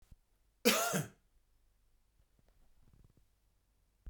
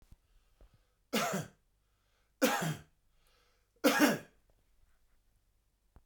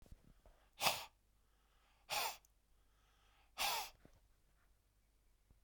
{"cough_length": "4.1 s", "cough_amplitude": 6933, "cough_signal_mean_std_ratio": 0.26, "three_cough_length": "6.1 s", "three_cough_amplitude": 7785, "three_cough_signal_mean_std_ratio": 0.31, "exhalation_length": "5.6 s", "exhalation_amplitude": 5187, "exhalation_signal_mean_std_ratio": 0.32, "survey_phase": "beta (2021-08-13 to 2022-03-07)", "age": "45-64", "gender": "Male", "wearing_mask": "No", "symptom_cough_any": true, "symptom_runny_or_blocked_nose": true, "symptom_shortness_of_breath": true, "symptom_fatigue": true, "symptom_onset": "2 days", "smoker_status": "Ex-smoker", "respiratory_condition_asthma": false, "respiratory_condition_other": false, "recruitment_source": "Test and Trace", "submission_delay": "1 day", "covid_test_result": "Positive", "covid_test_method": "RT-qPCR", "covid_ct_value": 19.5, "covid_ct_gene": "ORF1ab gene", "covid_ct_mean": 20.0, "covid_viral_load": "270000 copies/ml", "covid_viral_load_category": "Low viral load (10K-1M copies/ml)"}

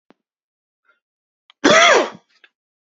{"cough_length": "2.8 s", "cough_amplitude": 29541, "cough_signal_mean_std_ratio": 0.32, "survey_phase": "beta (2021-08-13 to 2022-03-07)", "age": "18-44", "gender": "Male", "wearing_mask": "No", "symptom_cough_any": true, "symptom_new_continuous_cough": true, "symptom_runny_or_blocked_nose": true, "symptom_sore_throat": true, "symptom_fatigue": true, "symptom_headache": true, "symptom_onset": "3 days", "smoker_status": "Never smoked", "respiratory_condition_asthma": false, "respiratory_condition_other": false, "recruitment_source": "Test and Trace", "submission_delay": "2 days", "covid_test_result": "Positive", "covid_test_method": "RT-qPCR", "covid_ct_value": 22.5, "covid_ct_gene": "ORF1ab gene", "covid_ct_mean": 23.1, "covid_viral_load": "26000 copies/ml", "covid_viral_load_category": "Low viral load (10K-1M copies/ml)"}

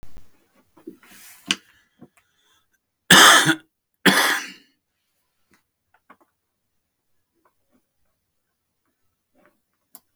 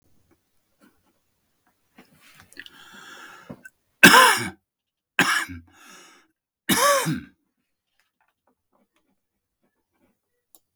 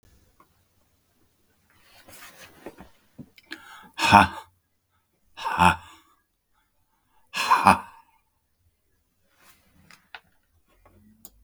{"cough_length": "10.2 s", "cough_amplitude": 32768, "cough_signal_mean_std_ratio": 0.22, "three_cough_length": "10.8 s", "three_cough_amplitude": 32768, "three_cough_signal_mean_std_ratio": 0.24, "exhalation_length": "11.4 s", "exhalation_amplitude": 32768, "exhalation_signal_mean_std_ratio": 0.22, "survey_phase": "beta (2021-08-13 to 2022-03-07)", "age": "45-64", "gender": "Male", "wearing_mask": "No", "symptom_cough_any": true, "symptom_shortness_of_breath": true, "symptom_fatigue": true, "symptom_onset": "4 days", "smoker_status": "Current smoker (11 or more cigarettes per day)", "respiratory_condition_asthma": true, "respiratory_condition_other": false, "recruitment_source": "REACT", "submission_delay": "3 days", "covid_test_result": "Negative", "covid_test_method": "RT-qPCR", "influenza_a_test_result": "Negative", "influenza_b_test_result": "Negative"}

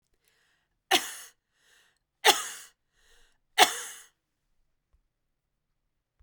{"three_cough_length": "6.2 s", "three_cough_amplitude": 32767, "three_cough_signal_mean_std_ratio": 0.21, "survey_phase": "beta (2021-08-13 to 2022-03-07)", "age": "45-64", "gender": "Female", "wearing_mask": "Yes", "symptom_sore_throat": true, "symptom_fatigue": true, "symptom_onset": "6 days", "smoker_status": "Never smoked", "respiratory_condition_asthma": false, "respiratory_condition_other": false, "recruitment_source": "Test and Trace", "submission_delay": "2 days", "covid_test_result": "Positive", "covid_test_method": "RT-qPCR", "covid_ct_value": 37.2, "covid_ct_gene": "ORF1ab gene"}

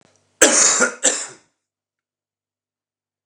{"cough_length": "3.3 s", "cough_amplitude": 29204, "cough_signal_mean_std_ratio": 0.35, "survey_phase": "beta (2021-08-13 to 2022-03-07)", "age": "45-64", "gender": "Male", "wearing_mask": "No", "symptom_none": true, "symptom_onset": "12 days", "smoker_status": "Current smoker (11 or more cigarettes per day)", "respiratory_condition_asthma": false, "respiratory_condition_other": false, "recruitment_source": "REACT", "submission_delay": "1 day", "covid_test_result": "Negative", "covid_test_method": "RT-qPCR"}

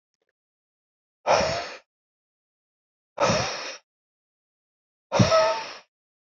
{"exhalation_length": "6.2 s", "exhalation_amplitude": 19648, "exhalation_signal_mean_std_ratio": 0.36, "survey_phase": "beta (2021-08-13 to 2022-03-07)", "age": "18-44", "gender": "Male", "wearing_mask": "No", "symptom_shortness_of_breath": true, "symptom_sore_throat": true, "symptom_fatigue": true, "symptom_headache": true, "symptom_onset": "3 days", "smoker_status": "Never smoked", "respiratory_condition_asthma": false, "respiratory_condition_other": false, "recruitment_source": "Test and Trace", "submission_delay": "-2 days", "covid_test_result": "Positive", "covid_test_method": "RT-qPCR", "covid_ct_value": 22.4, "covid_ct_gene": "ORF1ab gene", "covid_ct_mean": 22.6, "covid_viral_load": "39000 copies/ml", "covid_viral_load_category": "Low viral load (10K-1M copies/ml)"}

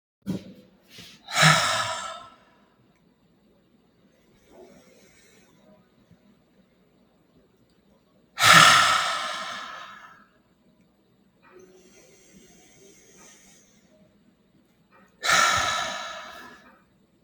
{"exhalation_length": "17.2 s", "exhalation_amplitude": 30620, "exhalation_signal_mean_std_ratio": 0.3, "survey_phase": "beta (2021-08-13 to 2022-03-07)", "age": "45-64", "gender": "Female", "wearing_mask": "No", "symptom_none": true, "smoker_status": "Ex-smoker", "respiratory_condition_asthma": false, "respiratory_condition_other": false, "recruitment_source": "REACT", "submission_delay": "1 day", "covid_test_result": "Negative", "covid_test_method": "RT-qPCR"}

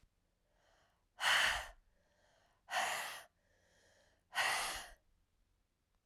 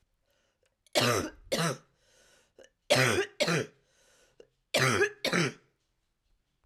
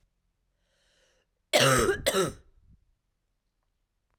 {"exhalation_length": "6.1 s", "exhalation_amplitude": 3049, "exhalation_signal_mean_std_ratio": 0.38, "three_cough_length": "6.7 s", "three_cough_amplitude": 8823, "three_cough_signal_mean_std_ratio": 0.43, "cough_length": "4.2 s", "cough_amplitude": 12174, "cough_signal_mean_std_ratio": 0.33, "survey_phase": "alpha (2021-03-01 to 2021-08-12)", "age": "45-64", "gender": "Female", "wearing_mask": "No", "symptom_abdominal_pain": true, "symptom_fever_high_temperature": true, "symptom_headache": true, "symptom_loss_of_taste": true, "smoker_status": "Never smoked", "respiratory_condition_asthma": false, "respiratory_condition_other": false, "recruitment_source": "Test and Trace", "submission_delay": "1 day", "covid_test_result": "Positive", "covid_test_method": "RT-qPCR"}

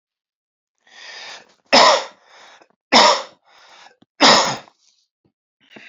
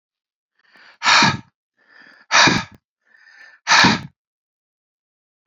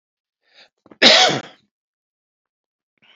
{"three_cough_length": "5.9 s", "three_cough_amplitude": 31173, "three_cough_signal_mean_std_ratio": 0.33, "exhalation_length": "5.5 s", "exhalation_amplitude": 31198, "exhalation_signal_mean_std_ratio": 0.34, "cough_length": "3.2 s", "cough_amplitude": 32204, "cough_signal_mean_std_ratio": 0.27, "survey_phase": "beta (2021-08-13 to 2022-03-07)", "age": "45-64", "gender": "Male", "wearing_mask": "No", "symptom_cough_any": true, "symptom_runny_or_blocked_nose": true, "symptom_headache": true, "smoker_status": "Never smoked", "respiratory_condition_asthma": false, "respiratory_condition_other": false, "recruitment_source": "Test and Trace", "submission_delay": "1 day", "covid_test_result": "Positive", "covid_test_method": "RT-qPCR", "covid_ct_value": 26.2, "covid_ct_gene": "S gene", "covid_ct_mean": 26.7, "covid_viral_load": "1700 copies/ml", "covid_viral_load_category": "Minimal viral load (< 10K copies/ml)"}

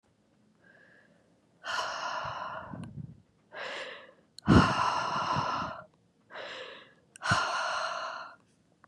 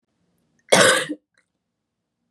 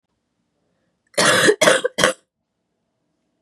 {"exhalation_length": "8.9 s", "exhalation_amplitude": 12593, "exhalation_signal_mean_std_ratio": 0.48, "cough_length": "2.3 s", "cough_amplitude": 32136, "cough_signal_mean_std_ratio": 0.3, "three_cough_length": "3.4 s", "three_cough_amplitude": 32767, "three_cough_signal_mean_std_ratio": 0.37, "survey_phase": "beta (2021-08-13 to 2022-03-07)", "age": "18-44", "gender": "Female", "wearing_mask": "No", "symptom_cough_any": true, "symptom_new_continuous_cough": true, "symptom_shortness_of_breath": true, "symptom_sore_throat": true, "symptom_fatigue": true, "symptom_fever_high_temperature": true, "smoker_status": "Ex-smoker", "respiratory_condition_asthma": false, "respiratory_condition_other": false, "recruitment_source": "Test and Trace", "submission_delay": "2 days", "covid_test_result": "Positive", "covid_test_method": "LFT"}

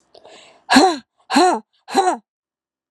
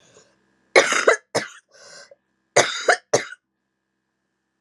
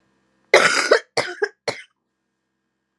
{"exhalation_length": "2.9 s", "exhalation_amplitude": 32767, "exhalation_signal_mean_std_ratio": 0.41, "three_cough_length": "4.6 s", "three_cough_amplitude": 32241, "three_cough_signal_mean_std_ratio": 0.31, "cough_length": "3.0 s", "cough_amplitude": 32767, "cough_signal_mean_std_ratio": 0.34, "survey_phase": "alpha (2021-03-01 to 2021-08-12)", "age": "18-44", "gender": "Female", "wearing_mask": "No", "symptom_cough_any": true, "symptom_fatigue": true, "symptom_headache": true, "symptom_change_to_sense_of_smell_or_taste": true, "symptom_loss_of_taste": true, "symptom_onset": "4 days", "smoker_status": "Never smoked", "respiratory_condition_asthma": false, "respiratory_condition_other": false, "recruitment_source": "Test and Trace", "submission_delay": "2 days", "covid_test_result": "Positive", "covid_test_method": "RT-qPCR", "covid_ct_value": 20.2, "covid_ct_gene": "ORF1ab gene", "covid_ct_mean": 20.6, "covid_viral_load": "180000 copies/ml", "covid_viral_load_category": "Low viral load (10K-1M copies/ml)"}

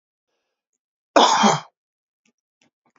{"cough_length": "3.0 s", "cough_amplitude": 27899, "cough_signal_mean_std_ratio": 0.29, "survey_phase": "alpha (2021-03-01 to 2021-08-12)", "age": "45-64", "gender": "Male", "wearing_mask": "No", "symptom_none": true, "smoker_status": "Never smoked", "respiratory_condition_asthma": false, "respiratory_condition_other": false, "recruitment_source": "REACT", "submission_delay": "3 days", "covid_test_result": "Negative", "covid_test_method": "RT-qPCR"}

